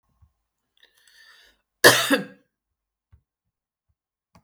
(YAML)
cough_length: 4.4 s
cough_amplitude: 32768
cough_signal_mean_std_ratio: 0.2
survey_phase: alpha (2021-03-01 to 2021-08-12)
age: 65+
gender: Female
wearing_mask: 'No'
symptom_none: true
symptom_onset: 12 days
smoker_status: Ex-smoker
respiratory_condition_asthma: false
respiratory_condition_other: false
recruitment_source: REACT
submission_delay: 1 day
covid_test_result: Negative
covid_test_method: RT-qPCR